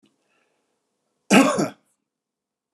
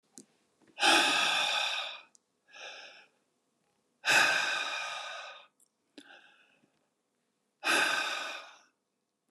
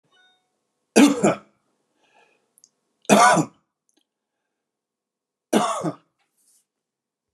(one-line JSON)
{"cough_length": "2.7 s", "cough_amplitude": 27208, "cough_signal_mean_std_ratio": 0.27, "exhalation_length": "9.3 s", "exhalation_amplitude": 8268, "exhalation_signal_mean_std_ratio": 0.45, "three_cough_length": "7.3 s", "three_cough_amplitude": 30550, "three_cough_signal_mean_std_ratio": 0.28, "survey_phase": "beta (2021-08-13 to 2022-03-07)", "age": "65+", "gender": "Male", "wearing_mask": "No", "symptom_none": true, "smoker_status": "Ex-smoker", "respiratory_condition_asthma": false, "respiratory_condition_other": false, "recruitment_source": "REACT", "submission_delay": "4 days", "covid_test_result": "Negative", "covid_test_method": "RT-qPCR", "influenza_a_test_result": "Unknown/Void", "influenza_b_test_result": "Unknown/Void"}